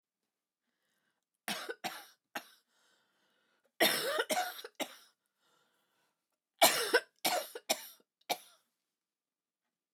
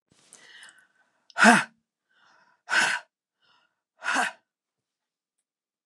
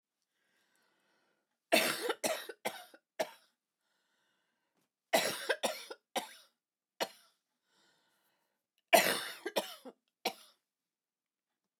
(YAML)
cough_length: 9.9 s
cough_amplitude: 8917
cough_signal_mean_std_ratio: 0.3
exhalation_length: 5.9 s
exhalation_amplitude: 27240
exhalation_signal_mean_std_ratio: 0.26
three_cough_length: 11.8 s
three_cough_amplitude: 9255
three_cough_signal_mean_std_ratio: 0.29
survey_phase: alpha (2021-03-01 to 2021-08-12)
age: 65+
gender: Female
wearing_mask: 'No'
symptom_cough_any: true
symptom_onset: 12 days
smoker_status: Ex-smoker
respiratory_condition_asthma: false
respiratory_condition_other: false
recruitment_source: REACT
submission_delay: 1 day
covid_test_result: Negative
covid_test_method: RT-qPCR